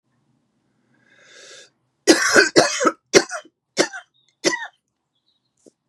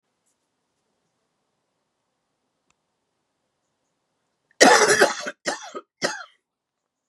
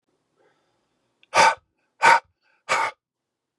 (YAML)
three_cough_length: 5.9 s
three_cough_amplitude: 32767
three_cough_signal_mean_std_ratio: 0.32
cough_length: 7.1 s
cough_amplitude: 32015
cough_signal_mean_std_ratio: 0.24
exhalation_length: 3.6 s
exhalation_amplitude: 23132
exhalation_signal_mean_std_ratio: 0.3
survey_phase: beta (2021-08-13 to 2022-03-07)
age: 45-64
gender: Male
wearing_mask: 'No'
symptom_cough_any: true
symptom_sore_throat: true
symptom_fatigue: true
symptom_fever_high_temperature: true
symptom_headache: true
symptom_onset: 1 day
smoker_status: Never smoked
respiratory_condition_asthma: false
respiratory_condition_other: false
recruitment_source: Test and Trace
submission_delay: 1 day
covid_test_result: Positive
covid_test_method: LAMP